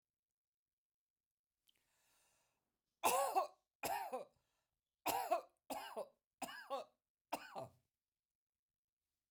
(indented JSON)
{
  "three_cough_length": "9.3 s",
  "three_cough_amplitude": 2541,
  "three_cough_signal_mean_std_ratio": 0.34,
  "survey_phase": "beta (2021-08-13 to 2022-03-07)",
  "age": "65+",
  "gender": "Female",
  "wearing_mask": "No",
  "symptom_none": true,
  "smoker_status": "Never smoked",
  "respiratory_condition_asthma": false,
  "respiratory_condition_other": false,
  "recruitment_source": "REACT",
  "submission_delay": "0 days",
  "covid_test_result": "Negative",
  "covid_test_method": "RT-qPCR"
}